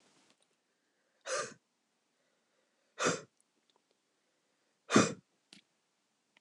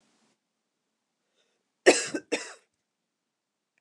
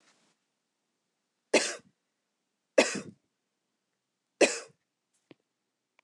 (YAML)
exhalation_length: 6.4 s
exhalation_amplitude: 10072
exhalation_signal_mean_std_ratio: 0.21
cough_length: 3.8 s
cough_amplitude: 21502
cough_signal_mean_std_ratio: 0.18
three_cough_length: 6.0 s
three_cough_amplitude: 14054
three_cough_signal_mean_std_ratio: 0.2
survey_phase: beta (2021-08-13 to 2022-03-07)
age: 45-64
gender: Female
wearing_mask: 'No'
symptom_runny_or_blocked_nose: true
smoker_status: Never smoked
respiratory_condition_asthma: false
respiratory_condition_other: false
recruitment_source: REACT
submission_delay: 1 day
covid_test_result: Negative
covid_test_method: RT-qPCR